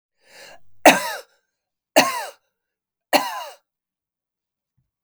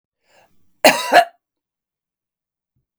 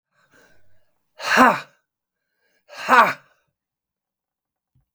three_cough_length: 5.0 s
three_cough_amplitude: 32767
three_cough_signal_mean_std_ratio: 0.25
cough_length: 3.0 s
cough_amplitude: 32768
cough_signal_mean_std_ratio: 0.24
exhalation_length: 4.9 s
exhalation_amplitude: 32766
exhalation_signal_mean_std_ratio: 0.26
survey_phase: beta (2021-08-13 to 2022-03-07)
age: 65+
gender: Female
wearing_mask: 'No'
symptom_runny_or_blocked_nose: true
symptom_headache: true
symptom_other: true
symptom_onset: 3 days
smoker_status: Ex-smoker
respiratory_condition_asthma: false
respiratory_condition_other: false
recruitment_source: Test and Trace
submission_delay: 1 day
covid_test_result: Positive
covid_test_method: RT-qPCR
covid_ct_value: 16.6
covid_ct_gene: ORF1ab gene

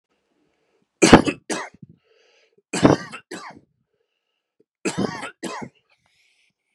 three_cough_length: 6.7 s
three_cough_amplitude: 32768
three_cough_signal_mean_std_ratio: 0.24
survey_phase: beta (2021-08-13 to 2022-03-07)
age: 45-64
gender: Male
wearing_mask: 'No'
symptom_runny_or_blocked_nose: true
symptom_headache: true
symptom_onset: 9 days
smoker_status: Never smoked
respiratory_condition_asthma: false
respiratory_condition_other: false
recruitment_source: REACT
submission_delay: 1 day
covid_test_result: Negative
covid_test_method: RT-qPCR
influenza_a_test_result: Negative
influenza_b_test_result: Negative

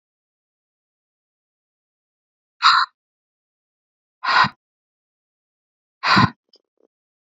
exhalation_length: 7.3 s
exhalation_amplitude: 27998
exhalation_signal_mean_std_ratio: 0.24
survey_phase: beta (2021-08-13 to 2022-03-07)
age: 45-64
gender: Female
wearing_mask: 'No'
symptom_none: true
smoker_status: Current smoker (1 to 10 cigarettes per day)
respiratory_condition_asthma: false
respiratory_condition_other: false
recruitment_source: REACT
submission_delay: 2 days
covid_test_result: Negative
covid_test_method: RT-qPCR
influenza_a_test_result: Unknown/Void
influenza_b_test_result: Unknown/Void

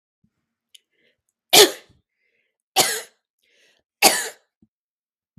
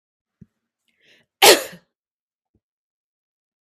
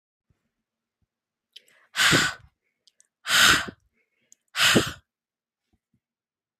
three_cough_length: 5.4 s
three_cough_amplitude: 32768
three_cough_signal_mean_std_ratio: 0.23
cough_length: 3.6 s
cough_amplitude: 32768
cough_signal_mean_std_ratio: 0.17
exhalation_length: 6.6 s
exhalation_amplitude: 27593
exhalation_signal_mean_std_ratio: 0.31
survey_phase: beta (2021-08-13 to 2022-03-07)
age: 18-44
gender: Female
wearing_mask: 'No'
symptom_none: true
smoker_status: Ex-smoker
respiratory_condition_asthma: false
respiratory_condition_other: false
recruitment_source: REACT
submission_delay: 1 day
covid_test_result: Negative
covid_test_method: RT-qPCR
influenza_a_test_result: Negative
influenza_b_test_result: Negative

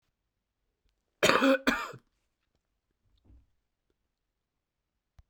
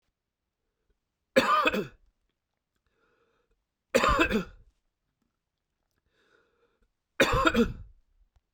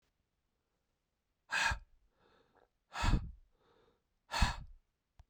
cough_length: 5.3 s
cough_amplitude: 18572
cough_signal_mean_std_ratio: 0.24
three_cough_length: 8.5 s
three_cough_amplitude: 14327
three_cough_signal_mean_std_ratio: 0.32
exhalation_length: 5.3 s
exhalation_amplitude: 5125
exhalation_signal_mean_std_ratio: 0.31
survey_phase: beta (2021-08-13 to 2022-03-07)
age: 18-44
gender: Male
wearing_mask: 'No'
symptom_cough_any: true
symptom_runny_or_blocked_nose: true
symptom_shortness_of_breath: true
symptom_headache: true
symptom_onset: 3 days
smoker_status: Never smoked
respiratory_condition_asthma: true
respiratory_condition_other: false
recruitment_source: Test and Trace
submission_delay: 2 days
covid_test_result: Positive
covid_test_method: RT-qPCR
covid_ct_value: 23.7
covid_ct_gene: ORF1ab gene
covid_ct_mean: 24.2
covid_viral_load: 11000 copies/ml
covid_viral_load_category: Low viral load (10K-1M copies/ml)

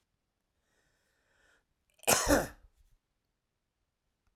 cough_length: 4.4 s
cough_amplitude: 11149
cough_signal_mean_std_ratio: 0.23
survey_phase: alpha (2021-03-01 to 2021-08-12)
age: 65+
gender: Male
wearing_mask: 'No'
symptom_none: true
smoker_status: Ex-smoker
respiratory_condition_asthma: false
respiratory_condition_other: false
recruitment_source: REACT
submission_delay: 1 day
covid_test_result: Negative
covid_test_method: RT-qPCR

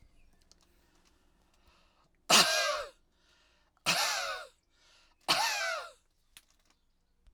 cough_length: 7.3 s
cough_amplitude: 10003
cough_signal_mean_std_ratio: 0.36
survey_phase: alpha (2021-03-01 to 2021-08-12)
age: 65+
gender: Male
wearing_mask: 'No'
symptom_none: true
smoker_status: Ex-smoker
respiratory_condition_asthma: false
respiratory_condition_other: false
recruitment_source: REACT
submission_delay: 1 day
covid_test_result: Negative
covid_test_method: RT-qPCR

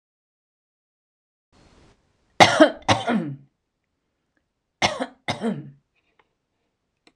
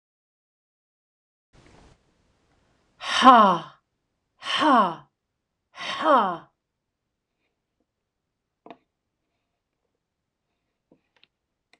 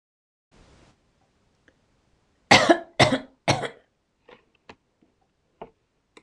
cough_length: 7.2 s
cough_amplitude: 26028
cough_signal_mean_std_ratio: 0.26
exhalation_length: 11.8 s
exhalation_amplitude: 26028
exhalation_signal_mean_std_ratio: 0.25
three_cough_length: 6.2 s
three_cough_amplitude: 26027
three_cough_signal_mean_std_ratio: 0.22
survey_phase: beta (2021-08-13 to 2022-03-07)
age: 65+
gender: Female
wearing_mask: 'No'
symptom_none: true
smoker_status: Ex-smoker
respiratory_condition_asthma: false
respiratory_condition_other: false
recruitment_source: REACT
submission_delay: 1 day
covid_test_result: Negative
covid_test_method: RT-qPCR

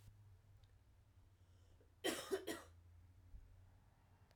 cough_length: 4.4 s
cough_amplitude: 1205
cough_signal_mean_std_ratio: 0.41
survey_phase: alpha (2021-03-01 to 2021-08-12)
age: 18-44
gender: Female
wearing_mask: 'No'
symptom_cough_any: true
symptom_shortness_of_breath: true
symptom_fatigue: true
symptom_fever_high_temperature: true
symptom_headache: true
symptom_onset: 3 days
smoker_status: Never smoked
respiratory_condition_asthma: false
respiratory_condition_other: false
recruitment_source: Test and Trace
submission_delay: 1 day
covid_test_result: Positive
covid_test_method: RT-qPCR
covid_ct_value: 23.7
covid_ct_gene: N gene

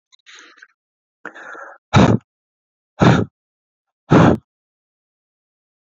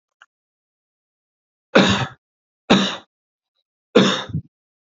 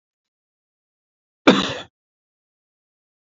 exhalation_length: 5.8 s
exhalation_amplitude: 31518
exhalation_signal_mean_std_ratio: 0.3
three_cough_length: 4.9 s
three_cough_amplitude: 28090
three_cough_signal_mean_std_ratio: 0.31
cough_length: 3.2 s
cough_amplitude: 29463
cough_signal_mean_std_ratio: 0.19
survey_phase: beta (2021-08-13 to 2022-03-07)
age: 18-44
gender: Male
wearing_mask: 'No'
symptom_none: true
smoker_status: Never smoked
respiratory_condition_asthma: false
respiratory_condition_other: false
recruitment_source: REACT
submission_delay: 1 day
covid_test_result: Negative
covid_test_method: RT-qPCR
influenza_a_test_result: Negative
influenza_b_test_result: Negative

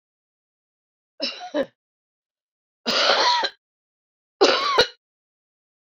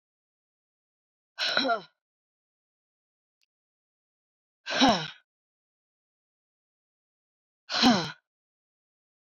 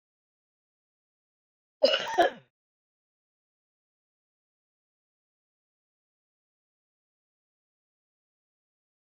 three_cough_length: 5.9 s
three_cough_amplitude: 23320
three_cough_signal_mean_std_ratio: 0.37
exhalation_length: 9.4 s
exhalation_amplitude: 13330
exhalation_signal_mean_std_ratio: 0.25
cough_length: 9.0 s
cough_amplitude: 11026
cough_signal_mean_std_ratio: 0.15
survey_phase: beta (2021-08-13 to 2022-03-07)
age: 45-64
gender: Female
wearing_mask: 'No'
symptom_cough_any: true
symptom_runny_or_blocked_nose: true
symptom_sore_throat: true
symptom_headache: true
symptom_onset: 6 days
smoker_status: Never smoked
respiratory_condition_asthma: true
respiratory_condition_other: false
recruitment_source: Test and Trace
submission_delay: 2 days
covid_test_result: Positive
covid_test_method: RT-qPCR
covid_ct_value: 30.6
covid_ct_gene: N gene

